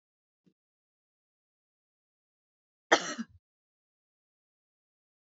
{"cough_length": "5.2 s", "cough_amplitude": 14903, "cough_signal_mean_std_ratio": 0.12, "survey_phase": "beta (2021-08-13 to 2022-03-07)", "age": "45-64", "gender": "Female", "wearing_mask": "No", "symptom_none": true, "smoker_status": "Never smoked", "respiratory_condition_asthma": false, "respiratory_condition_other": false, "recruitment_source": "REACT", "submission_delay": "1 day", "covid_test_result": "Negative", "covid_test_method": "RT-qPCR", "influenza_a_test_result": "Negative", "influenza_b_test_result": "Negative"}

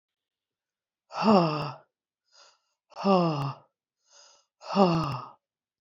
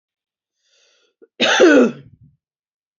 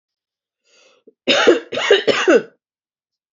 {"exhalation_length": "5.8 s", "exhalation_amplitude": 15715, "exhalation_signal_mean_std_ratio": 0.39, "cough_length": "3.0 s", "cough_amplitude": 28108, "cough_signal_mean_std_ratio": 0.34, "three_cough_length": "3.3 s", "three_cough_amplitude": 28883, "three_cough_signal_mean_std_ratio": 0.41, "survey_phase": "beta (2021-08-13 to 2022-03-07)", "age": "45-64", "gender": "Female", "wearing_mask": "No", "symptom_cough_any": true, "symptom_runny_or_blocked_nose": true, "symptom_fever_high_temperature": true, "smoker_status": "Never smoked", "respiratory_condition_asthma": true, "respiratory_condition_other": false, "recruitment_source": "Test and Trace", "submission_delay": "2 days", "covid_test_result": "Positive", "covid_test_method": "RT-qPCR", "covid_ct_value": 23.3, "covid_ct_gene": "ORF1ab gene", "covid_ct_mean": 23.6, "covid_viral_load": "18000 copies/ml", "covid_viral_load_category": "Low viral load (10K-1M copies/ml)"}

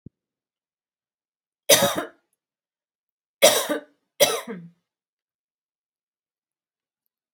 {"three_cough_length": "7.3 s", "three_cough_amplitude": 32767, "three_cough_signal_mean_std_ratio": 0.24, "survey_phase": "beta (2021-08-13 to 2022-03-07)", "age": "45-64", "gender": "Female", "wearing_mask": "No", "symptom_none": true, "smoker_status": "Never smoked", "respiratory_condition_asthma": false, "respiratory_condition_other": false, "recruitment_source": "REACT", "submission_delay": "2 days", "covid_test_result": "Negative", "covid_test_method": "RT-qPCR"}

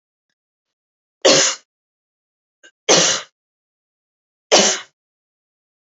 {"three_cough_length": "5.8 s", "three_cough_amplitude": 30126, "three_cough_signal_mean_std_ratio": 0.3, "survey_phase": "alpha (2021-03-01 to 2021-08-12)", "age": "18-44", "gender": "Female", "wearing_mask": "No", "symptom_none": true, "smoker_status": "Never smoked", "respiratory_condition_asthma": false, "respiratory_condition_other": false, "recruitment_source": "REACT", "submission_delay": "2 days", "covid_test_result": "Negative", "covid_test_method": "RT-qPCR"}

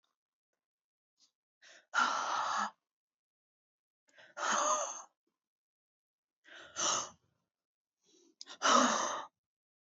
{"exhalation_length": "9.9 s", "exhalation_amplitude": 6859, "exhalation_signal_mean_std_ratio": 0.37, "survey_phase": "beta (2021-08-13 to 2022-03-07)", "age": "18-44", "gender": "Female", "wearing_mask": "No", "symptom_cough_any": true, "symptom_runny_or_blocked_nose": true, "symptom_sore_throat": true, "symptom_change_to_sense_of_smell_or_taste": true, "symptom_onset": "4 days", "smoker_status": "Never smoked", "respiratory_condition_asthma": true, "respiratory_condition_other": false, "recruitment_source": "REACT", "submission_delay": "1 day", "covid_test_result": "Negative", "covid_test_method": "RT-qPCR", "influenza_a_test_result": "Negative", "influenza_b_test_result": "Negative"}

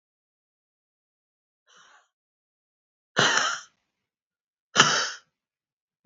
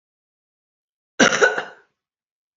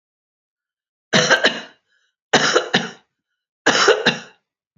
{"exhalation_length": "6.1 s", "exhalation_amplitude": 32297, "exhalation_signal_mean_std_ratio": 0.25, "cough_length": "2.6 s", "cough_amplitude": 28345, "cough_signal_mean_std_ratio": 0.28, "three_cough_length": "4.8 s", "three_cough_amplitude": 32767, "three_cough_signal_mean_std_ratio": 0.41, "survey_phase": "beta (2021-08-13 to 2022-03-07)", "age": "65+", "gender": "Female", "wearing_mask": "No", "symptom_none": true, "smoker_status": "Never smoked", "respiratory_condition_asthma": false, "respiratory_condition_other": false, "recruitment_source": "REACT", "submission_delay": "1 day", "covid_test_result": "Negative", "covid_test_method": "RT-qPCR", "influenza_a_test_result": "Negative", "influenza_b_test_result": "Negative"}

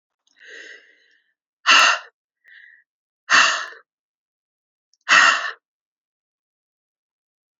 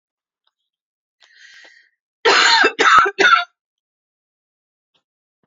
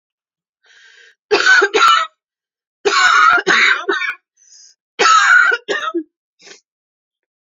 {"exhalation_length": "7.6 s", "exhalation_amplitude": 29172, "exhalation_signal_mean_std_ratio": 0.29, "cough_length": "5.5 s", "cough_amplitude": 30272, "cough_signal_mean_std_ratio": 0.36, "three_cough_length": "7.5 s", "three_cough_amplitude": 31196, "three_cough_signal_mean_std_ratio": 0.52, "survey_phase": "beta (2021-08-13 to 2022-03-07)", "age": "45-64", "gender": "Female", "wearing_mask": "No", "symptom_cough_any": true, "symptom_runny_or_blocked_nose": true, "symptom_shortness_of_breath": true, "symptom_sore_throat": true, "symptom_fatigue": true, "symptom_onset": "5 days", "smoker_status": "Ex-smoker", "respiratory_condition_asthma": false, "respiratory_condition_other": false, "recruitment_source": "Test and Trace", "submission_delay": "2 days", "covid_test_result": "Positive", "covid_test_method": "RT-qPCR"}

